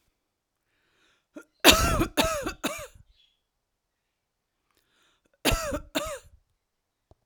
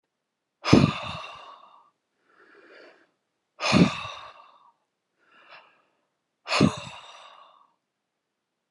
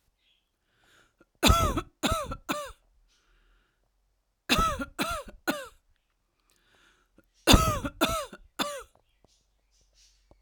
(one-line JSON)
{"cough_length": "7.3 s", "cough_amplitude": 32768, "cough_signal_mean_std_ratio": 0.3, "exhalation_length": "8.7 s", "exhalation_amplitude": 27280, "exhalation_signal_mean_std_ratio": 0.26, "three_cough_length": "10.4 s", "three_cough_amplitude": 22960, "three_cough_signal_mean_std_ratio": 0.33, "survey_phase": "alpha (2021-03-01 to 2021-08-12)", "age": "45-64", "gender": "Female", "wearing_mask": "No", "symptom_none": true, "symptom_onset": "11 days", "smoker_status": "Ex-smoker", "respiratory_condition_asthma": false, "respiratory_condition_other": false, "recruitment_source": "REACT", "submission_delay": "11 days", "covid_test_result": "Negative", "covid_test_method": "RT-qPCR"}